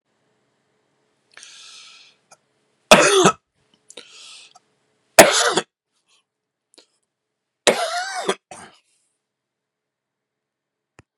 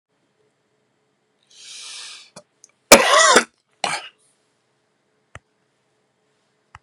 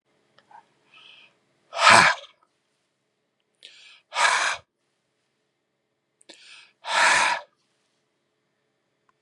{
  "three_cough_length": "11.2 s",
  "three_cough_amplitude": 32768,
  "three_cough_signal_mean_std_ratio": 0.24,
  "cough_length": "6.8 s",
  "cough_amplitude": 32768,
  "cough_signal_mean_std_ratio": 0.23,
  "exhalation_length": "9.2 s",
  "exhalation_amplitude": 32230,
  "exhalation_signal_mean_std_ratio": 0.28,
  "survey_phase": "beta (2021-08-13 to 2022-03-07)",
  "age": "65+",
  "gender": "Male",
  "wearing_mask": "No",
  "symptom_cough_any": true,
  "symptom_runny_or_blocked_nose": true,
  "symptom_sore_throat": true,
  "symptom_fatigue": true,
  "symptom_other": true,
  "smoker_status": "Never smoked",
  "respiratory_condition_asthma": true,
  "respiratory_condition_other": false,
  "recruitment_source": "Test and Trace",
  "submission_delay": "2 days",
  "covid_test_result": "Positive",
  "covid_test_method": "LFT"
}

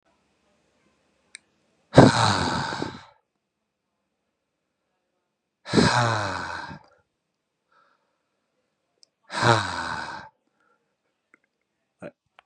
{
  "exhalation_length": "12.5 s",
  "exhalation_amplitude": 32767,
  "exhalation_signal_mean_std_ratio": 0.29,
  "survey_phase": "beta (2021-08-13 to 2022-03-07)",
  "age": "18-44",
  "gender": "Male",
  "wearing_mask": "No",
  "symptom_cough_any": true,
  "symptom_runny_or_blocked_nose": true,
  "symptom_shortness_of_breath": true,
  "symptom_sore_throat": true,
  "symptom_fatigue": true,
  "symptom_onset": "4 days",
  "smoker_status": "Ex-smoker",
  "respiratory_condition_asthma": false,
  "respiratory_condition_other": false,
  "recruitment_source": "Test and Trace",
  "submission_delay": "2 days",
  "covid_test_result": "Positive",
  "covid_test_method": "RT-qPCR"
}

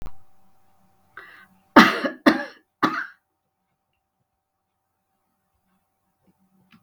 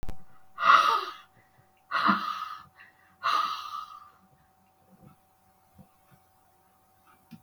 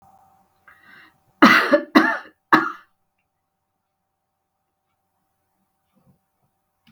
{
  "three_cough_length": "6.8 s",
  "three_cough_amplitude": 32768,
  "three_cough_signal_mean_std_ratio": 0.22,
  "exhalation_length": "7.4 s",
  "exhalation_amplitude": 15596,
  "exhalation_signal_mean_std_ratio": 0.38,
  "cough_length": "6.9 s",
  "cough_amplitude": 32768,
  "cough_signal_mean_std_ratio": 0.24,
  "survey_phase": "beta (2021-08-13 to 2022-03-07)",
  "age": "65+",
  "gender": "Female",
  "wearing_mask": "No",
  "symptom_none": true,
  "smoker_status": "Never smoked",
  "respiratory_condition_asthma": false,
  "respiratory_condition_other": false,
  "recruitment_source": "REACT",
  "submission_delay": "2 days",
  "covid_test_result": "Negative",
  "covid_test_method": "RT-qPCR",
  "influenza_a_test_result": "Negative",
  "influenza_b_test_result": "Negative"
}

